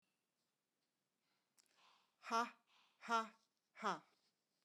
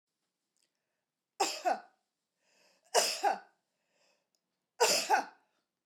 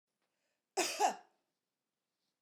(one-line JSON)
{"exhalation_length": "4.6 s", "exhalation_amplitude": 1472, "exhalation_signal_mean_std_ratio": 0.25, "three_cough_length": "5.9 s", "three_cough_amplitude": 7750, "three_cough_signal_mean_std_ratio": 0.33, "cough_length": "2.4 s", "cough_amplitude": 4400, "cough_signal_mean_std_ratio": 0.29, "survey_phase": "beta (2021-08-13 to 2022-03-07)", "age": "45-64", "gender": "Female", "wearing_mask": "No", "symptom_none": true, "symptom_onset": "12 days", "smoker_status": "Never smoked", "respiratory_condition_asthma": false, "respiratory_condition_other": false, "recruitment_source": "REACT", "submission_delay": "2 days", "covid_test_result": "Negative", "covid_test_method": "RT-qPCR", "influenza_a_test_result": "Negative", "influenza_b_test_result": "Negative"}